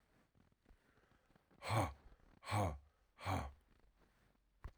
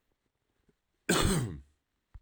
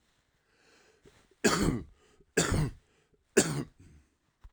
exhalation_length: 4.8 s
exhalation_amplitude: 1928
exhalation_signal_mean_std_ratio: 0.37
cough_length: 2.2 s
cough_amplitude: 6581
cough_signal_mean_std_ratio: 0.38
three_cough_length: 4.5 s
three_cough_amplitude: 11927
three_cough_signal_mean_std_ratio: 0.36
survey_phase: beta (2021-08-13 to 2022-03-07)
age: 45-64
gender: Male
wearing_mask: 'No'
symptom_cough_any: true
symptom_new_continuous_cough: true
symptom_runny_or_blocked_nose: true
symptom_shortness_of_breath: true
symptom_fatigue: true
symptom_fever_high_temperature: true
symptom_headache: true
symptom_onset: 3 days
smoker_status: Ex-smoker
respiratory_condition_asthma: false
respiratory_condition_other: false
recruitment_source: Test and Trace
submission_delay: 1 day
covid_test_result: Positive
covid_test_method: RT-qPCR
covid_ct_value: 17.4
covid_ct_gene: ORF1ab gene
covid_ct_mean: 18.5
covid_viral_load: 840000 copies/ml
covid_viral_load_category: Low viral load (10K-1M copies/ml)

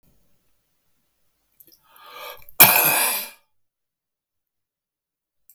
cough_length: 5.5 s
cough_amplitude: 32768
cough_signal_mean_std_ratio: 0.25
survey_phase: beta (2021-08-13 to 2022-03-07)
age: 65+
gender: Male
wearing_mask: 'No'
symptom_none: true
smoker_status: Never smoked
respiratory_condition_asthma: true
respiratory_condition_other: false
recruitment_source: REACT
submission_delay: 2 days
covid_test_result: Negative
covid_test_method: RT-qPCR
influenza_a_test_result: Negative
influenza_b_test_result: Negative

